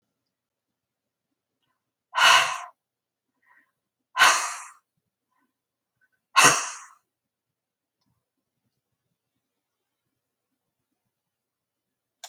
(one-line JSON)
{"exhalation_length": "12.3 s", "exhalation_amplitude": 29827, "exhalation_signal_mean_std_ratio": 0.22, "survey_phase": "beta (2021-08-13 to 2022-03-07)", "age": "65+", "gender": "Female", "wearing_mask": "No", "symptom_none": true, "smoker_status": "Ex-smoker", "respiratory_condition_asthma": false, "respiratory_condition_other": false, "recruitment_source": "REACT", "submission_delay": "6 days", "covid_test_result": "Negative", "covid_test_method": "RT-qPCR", "influenza_a_test_result": "Negative", "influenza_b_test_result": "Negative"}